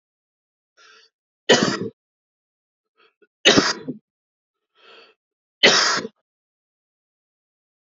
{"three_cough_length": "7.9 s", "three_cough_amplitude": 29537, "three_cough_signal_mean_std_ratio": 0.27, "survey_phase": "alpha (2021-03-01 to 2021-08-12)", "age": "18-44", "gender": "Male", "wearing_mask": "No", "symptom_cough_any": true, "symptom_headache": true, "symptom_onset": "4 days", "smoker_status": "Never smoked", "respiratory_condition_asthma": true, "respiratory_condition_other": false, "recruitment_source": "Test and Trace", "submission_delay": "2 days", "covid_test_result": "Positive", "covid_test_method": "RT-qPCR", "covid_ct_value": 12.7, "covid_ct_gene": "ORF1ab gene"}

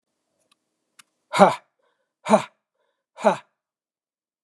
{"exhalation_length": "4.4 s", "exhalation_amplitude": 32407, "exhalation_signal_mean_std_ratio": 0.22, "survey_phase": "beta (2021-08-13 to 2022-03-07)", "age": "45-64", "gender": "Male", "wearing_mask": "No", "symptom_abdominal_pain": true, "smoker_status": "Ex-smoker", "respiratory_condition_asthma": false, "respiratory_condition_other": false, "recruitment_source": "REACT", "submission_delay": "1 day", "covid_test_result": "Negative", "covid_test_method": "RT-qPCR"}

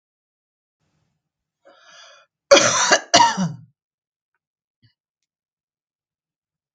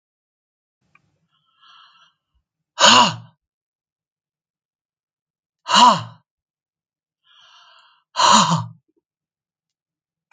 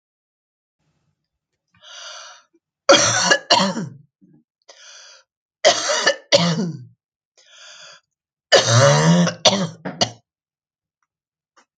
{"cough_length": "6.7 s", "cough_amplitude": 32767, "cough_signal_mean_std_ratio": 0.26, "exhalation_length": "10.3 s", "exhalation_amplitude": 32766, "exhalation_signal_mean_std_ratio": 0.26, "three_cough_length": "11.8 s", "three_cough_amplitude": 32767, "three_cough_signal_mean_std_ratio": 0.39, "survey_phase": "beta (2021-08-13 to 2022-03-07)", "age": "65+", "gender": "Female", "wearing_mask": "No", "symptom_cough_any": true, "smoker_status": "Ex-smoker", "respiratory_condition_asthma": false, "respiratory_condition_other": false, "recruitment_source": "REACT", "submission_delay": "1 day", "covid_test_result": "Negative", "covid_test_method": "RT-qPCR", "influenza_a_test_result": "Negative", "influenza_b_test_result": "Negative"}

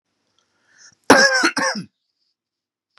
{"cough_length": "3.0 s", "cough_amplitude": 32768, "cough_signal_mean_std_ratio": 0.34, "survey_phase": "beta (2021-08-13 to 2022-03-07)", "age": "45-64", "gender": "Male", "wearing_mask": "No", "symptom_none": true, "smoker_status": "Never smoked", "respiratory_condition_asthma": false, "respiratory_condition_other": false, "recruitment_source": "REACT", "submission_delay": "2 days", "covid_test_result": "Negative", "covid_test_method": "RT-qPCR", "influenza_a_test_result": "Negative", "influenza_b_test_result": "Negative"}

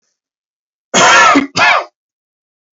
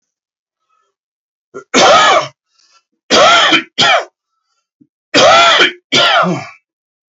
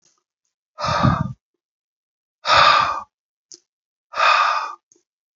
{"cough_length": "2.7 s", "cough_amplitude": 32201, "cough_signal_mean_std_ratio": 0.48, "three_cough_length": "7.1 s", "three_cough_amplitude": 32768, "three_cough_signal_mean_std_ratio": 0.52, "exhalation_length": "5.4 s", "exhalation_amplitude": 26696, "exhalation_signal_mean_std_ratio": 0.42, "survey_phase": "beta (2021-08-13 to 2022-03-07)", "age": "18-44", "gender": "Male", "wearing_mask": "No", "symptom_cough_any": true, "symptom_runny_or_blocked_nose": true, "symptom_sore_throat": true, "symptom_fatigue": true, "symptom_fever_high_temperature": true, "symptom_headache": true, "symptom_onset": "2 days", "smoker_status": "Ex-smoker", "respiratory_condition_asthma": false, "respiratory_condition_other": false, "recruitment_source": "Test and Trace", "submission_delay": "1 day", "covid_test_result": "Positive", "covid_test_method": "RT-qPCR", "covid_ct_value": 33.4, "covid_ct_gene": "N gene"}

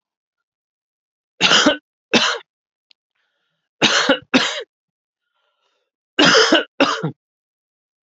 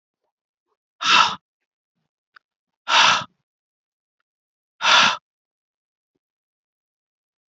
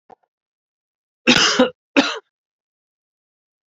{"three_cough_length": "8.1 s", "three_cough_amplitude": 32767, "three_cough_signal_mean_std_ratio": 0.37, "exhalation_length": "7.5 s", "exhalation_amplitude": 31971, "exhalation_signal_mean_std_ratio": 0.28, "cough_length": "3.7 s", "cough_amplitude": 32767, "cough_signal_mean_std_ratio": 0.3, "survey_phase": "beta (2021-08-13 to 2022-03-07)", "age": "18-44", "gender": "Male", "wearing_mask": "No", "symptom_cough_any": true, "symptom_runny_or_blocked_nose": true, "symptom_headache": true, "symptom_onset": "4 days", "smoker_status": "Ex-smoker", "respiratory_condition_asthma": false, "respiratory_condition_other": false, "recruitment_source": "Test and Trace", "submission_delay": "2 days", "covid_test_result": "Positive", "covid_test_method": "RT-qPCR", "covid_ct_value": 21.6, "covid_ct_gene": "ORF1ab gene"}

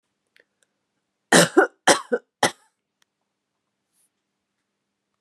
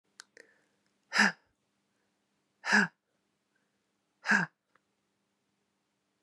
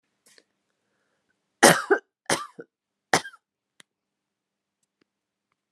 {"cough_length": "5.2 s", "cough_amplitude": 32585, "cough_signal_mean_std_ratio": 0.23, "exhalation_length": "6.2 s", "exhalation_amplitude": 9166, "exhalation_signal_mean_std_ratio": 0.23, "three_cough_length": "5.7 s", "three_cough_amplitude": 32766, "three_cough_signal_mean_std_ratio": 0.19, "survey_phase": "alpha (2021-03-01 to 2021-08-12)", "age": "45-64", "gender": "Female", "wearing_mask": "No", "symptom_none": true, "smoker_status": "Never smoked", "respiratory_condition_asthma": false, "respiratory_condition_other": false, "recruitment_source": "REACT", "submission_delay": "1 day", "covid_test_result": "Negative", "covid_test_method": "RT-qPCR"}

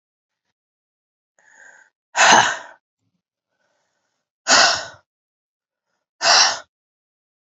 {"exhalation_length": "7.6 s", "exhalation_amplitude": 30239, "exhalation_signal_mean_std_ratio": 0.29, "survey_phase": "beta (2021-08-13 to 2022-03-07)", "age": "45-64", "gender": "Female", "wearing_mask": "No", "symptom_new_continuous_cough": true, "symptom_runny_or_blocked_nose": true, "symptom_headache": true, "symptom_onset": "3 days", "smoker_status": "Never smoked", "respiratory_condition_asthma": false, "respiratory_condition_other": false, "recruitment_source": "Test and Trace", "submission_delay": "2 days", "covid_test_result": "Positive", "covid_test_method": "RT-qPCR", "covid_ct_value": 13.6, "covid_ct_gene": "S gene", "covid_ct_mean": 14.0, "covid_viral_load": "26000000 copies/ml", "covid_viral_load_category": "High viral load (>1M copies/ml)"}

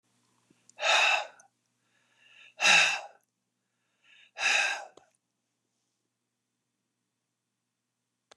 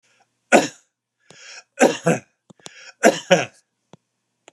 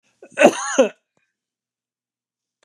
{"exhalation_length": "8.4 s", "exhalation_amplitude": 11150, "exhalation_signal_mean_std_ratio": 0.3, "three_cough_length": "4.5 s", "three_cough_amplitude": 32767, "three_cough_signal_mean_std_ratio": 0.29, "cough_length": "2.6 s", "cough_amplitude": 32768, "cough_signal_mean_std_ratio": 0.26, "survey_phase": "beta (2021-08-13 to 2022-03-07)", "age": "65+", "gender": "Male", "wearing_mask": "No", "symptom_none": true, "smoker_status": "Ex-smoker", "respiratory_condition_asthma": false, "respiratory_condition_other": false, "recruitment_source": "REACT", "submission_delay": "1 day", "covid_test_result": "Negative", "covid_test_method": "RT-qPCR"}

